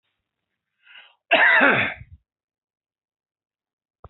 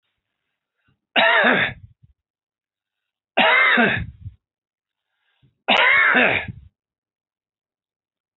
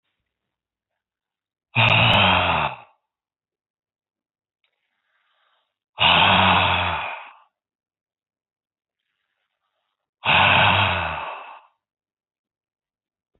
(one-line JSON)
{"cough_length": "4.1 s", "cough_amplitude": 23343, "cough_signal_mean_std_ratio": 0.31, "three_cough_length": "8.4 s", "three_cough_amplitude": 25348, "three_cough_signal_mean_std_ratio": 0.41, "exhalation_length": "13.4 s", "exhalation_amplitude": 24908, "exhalation_signal_mean_std_ratio": 0.39, "survey_phase": "alpha (2021-03-01 to 2021-08-12)", "age": "45-64", "gender": "Male", "wearing_mask": "No", "symptom_none": true, "smoker_status": "Never smoked", "respiratory_condition_asthma": false, "respiratory_condition_other": false, "recruitment_source": "REACT", "submission_delay": "1 day", "covid_test_result": "Negative", "covid_test_method": "RT-qPCR"}